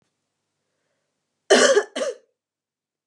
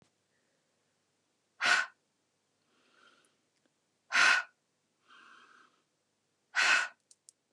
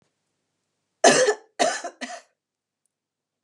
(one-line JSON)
{"cough_length": "3.1 s", "cough_amplitude": 25961, "cough_signal_mean_std_ratio": 0.3, "exhalation_length": "7.5 s", "exhalation_amplitude": 7616, "exhalation_signal_mean_std_ratio": 0.27, "three_cough_length": "3.4 s", "three_cough_amplitude": 26973, "three_cough_signal_mean_std_ratio": 0.3, "survey_phase": "beta (2021-08-13 to 2022-03-07)", "age": "45-64", "gender": "Female", "wearing_mask": "No", "symptom_none": true, "smoker_status": "Ex-smoker", "respiratory_condition_asthma": false, "respiratory_condition_other": false, "recruitment_source": "REACT", "submission_delay": "1 day", "covid_test_result": "Negative", "covid_test_method": "RT-qPCR", "influenza_a_test_result": "Unknown/Void", "influenza_b_test_result": "Unknown/Void"}